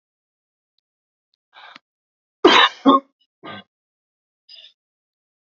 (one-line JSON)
{"cough_length": "5.5 s", "cough_amplitude": 32767, "cough_signal_mean_std_ratio": 0.22, "survey_phase": "beta (2021-08-13 to 2022-03-07)", "age": "45-64", "gender": "Male", "wearing_mask": "No", "symptom_none": true, "smoker_status": "Never smoked", "respiratory_condition_asthma": false, "respiratory_condition_other": false, "recruitment_source": "REACT", "submission_delay": "1 day", "covid_test_result": "Negative", "covid_test_method": "RT-qPCR"}